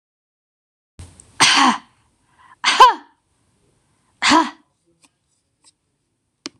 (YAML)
exhalation_length: 6.6 s
exhalation_amplitude: 26028
exhalation_signal_mean_std_ratio: 0.29
survey_phase: beta (2021-08-13 to 2022-03-07)
age: 45-64
gender: Female
wearing_mask: 'No'
symptom_none: true
smoker_status: Never smoked
respiratory_condition_asthma: false
respiratory_condition_other: false
recruitment_source: REACT
submission_delay: 2 days
covid_test_result: Negative
covid_test_method: RT-qPCR